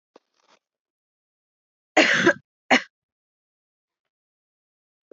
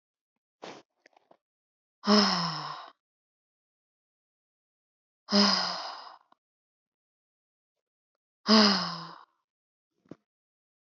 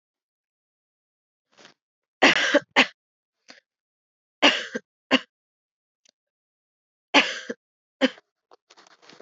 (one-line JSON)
{"cough_length": "5.1 s", "cough_amplitude": 20432, "cough_signal_mean_std_ratio": 0.23, "exhalation_length": "10.8 s", "exhalation_amplitude": 13607, "exhalation_signal_mean_std_ratio": 0.29, "three_cough_length": "9.2 s", "three_cough_amplitude": 25912, "three_cough_signal_mean_std_ratio": 0.24, "survey_phase": "beta (2021-08-13 to 2022-03-07)", "age": "18-44", "gender": "Female", "wearing_mask": "No", "symptom_runny_or_blocked_nose": true, "smoker_status": "Never smoked", "respiratory_condition_asthma": false, "respiratory_condition_other": false, "recruitment_source": "REACT", "submission_delay": "3 days", "covid_test_result": "Negative", "covid_test_method": "RT-qPCR", "influenza_a_test_result": "Negative", "influenza_b_test_result": "Negative"}